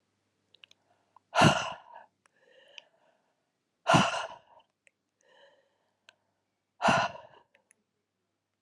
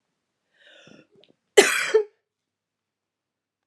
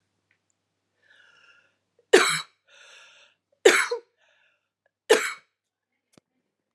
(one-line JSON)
{"exhalation_length": "8.6 s", "exhalation_amplitude": 11403, "exhalation_signal_mean_std_ratio": 0.26, "cough_length": "3.7 s", "cough_amplitude": 31181, "cough_signal_mean_std_ratio": 0.23, "three_cough_length": "6.7 s", "three_cough_amplitude": 28933, "three_cough_signal_mean_std_ratio": 0.23, "survey_phase": "beta (2021-08-13 to 2022-03-07)", "age": "45-64", "gender": "Female", "wearing_mask": "No", "symptom_cough_any": true, "symptom_runny_or_blocked_nose": true, "symptom_shortness_of_breath": true, "symptom_sore_throat": true, "symptom_fatigue": true, "symptom_headache": true, "symptom_change_to_sense_of_smell_or_taste": true, "symptom_other": true, "symptom_onset": "4 days", "smoker_status": "Never smoked", "respiratory_condition_asthma": false, "respiratory_condition_other": false, "recruitment_source": "Test and Trace", "submission_delay": "2 days", "covid_test_result": "Positive", "covid_test_method": "RT-qPCR", "covid_ct_value": 14.0, "covid_ct_gene": "ORF1ab gene", "covid_ct_mean": 15.1, "covid_viral_load": "11000000 copies/ml", "covid_viral_load_category": "High viral load (>1M copies/ml)"}